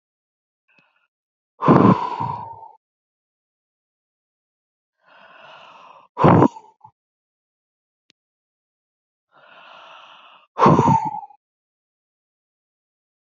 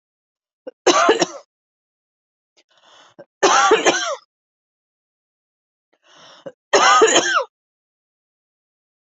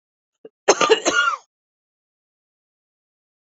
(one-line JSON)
{"exhalation_length": "13.3 s", "exhalation_amplitude": 31791, "exhalation_signal_mean_std_ratio": 0.26, "three_cough_length": "9.0 s", "three_cough_amplitude": 31837, "three_cough_signal_mean_std_ratio": 0.35, "cough_length": "3.6 s", "cough_amplitude": 29777, "cough_signal_mean_std_ratio": 0.29, "survey_phase": "beta (2021-08-13 to 2022-03-07)", "age": "45-64", "gender": "Female", "wearing_mask": "No", "symptom_headache": true, "symptom_onset": "7 days", "smoker_status": "Never smoked", "respiratory_condition_asthma": false, "respiratory_condition_other": false, "recruitment_source": "REACT", "submission_delay": "3 days", "covid_test_result": "Negative", "covid_test_method": "RT-qPCR"}